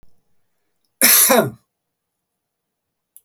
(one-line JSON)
{"cough_length": "3.2 s", "cough_amplitude": 32768, "cough_signal_mean_std_ratio": 0.31, "survey_phase": "beta (2021-08-13 to 2022-03-07)", "age": "65+", "gender": "Male", "wearing_mask": "No", "symptom_none": true, "smoker_status": "Ex-smoker", "respiratory_condition_asthma": false, "respiratory_condition_other": true, "recruitment_source": "REACT", "submission_delay": "1 day", "covid_test_result": "Negative", "covid_test_method": "RT-qPCR", "influenza_a_test_result": "Negative", "influenza_b_test_result": "Negative"}